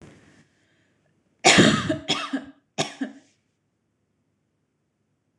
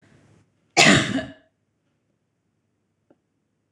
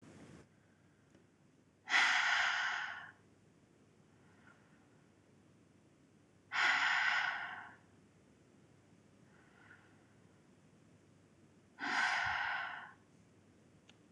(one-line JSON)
{"three_cough_length": "5.4 s", "three_cough_amplitude": 25913, "three_cough_signal_mean_std_ratio": 0.29, "cough_length": "3.7 s", "cough_amplitude": 26028, "cough_signal_mean_std_ratio": 0.26, "exhalation_length": "14.1 s", "exhalation_amplitude": 4477, "exhalation_signal_mean_std_ratio": 0.42, "survey_phase": "beta (2021-08-13 to 2022-03-07)", "age": "18-44", "gender": "Female", "wearing_mask": "No", "symptom_sore_throat": true, "symptom_onset": "10 days", "smoker_status": "Never smoked", "respiratory_condition_asthma": false, "respiratory_condition_other": false, "recruitment_source": "REACT", "submission_delay": "1 day", "covid_test_result": "Negative", "covid_test_method": "RT-qPCR", "influenza_a_test_result": "Unknown/Void", "influenza_b_test_result": "Unknown/Void"}